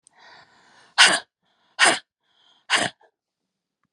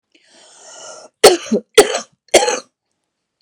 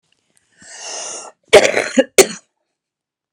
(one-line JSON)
{"exhalation_length": "3.9 s", "exhalation_amplitude": 30609, "exhalation_signal_mean_std_ratio": 0.28, "three_cough_length": "3.4 s", "three_cough_amplitude": 32768, "three_cough_signal_mean_std_ratio": 0.32, "cough_length": "3.3 s", "cough_amplitude": 32768, "cough_signal_mean_std_ratio": 0.3, "survey_phase": "beta (2021-08-13 to 2022-03-07)", "age": "45-64", "gender": "Female", "wearing_mask": "No", "symptom_cough_any": true, "symptom_runny_or_blocked_nose": true, "symptom_sore_throat": true, "symptom_abdominal_pain": true, "symptom_diarrhoea": true, "symptom_fatigue": true, "symptom_fever_high_temperature": true, "symptom_headache": true, "symptom_onset": "2 days", "smoker_status": "Ex-smoker", "respiratory_condition_asthma": false, "respiratory_condition_other": false, "recruitment_source": "Test and Trace", "submission_delay": "2 days", "covid_test_result": "Positive", "covid_test_method": "RT-qPCR", "covid_ct_value": 13.0, "covid_ct_gene": "N gene", "covid_ct_mean": 13.5, "covid_viral_load": "38000000 copies/ml", "covid_viral_load_category": "High viral load (>1M copies/ml)"}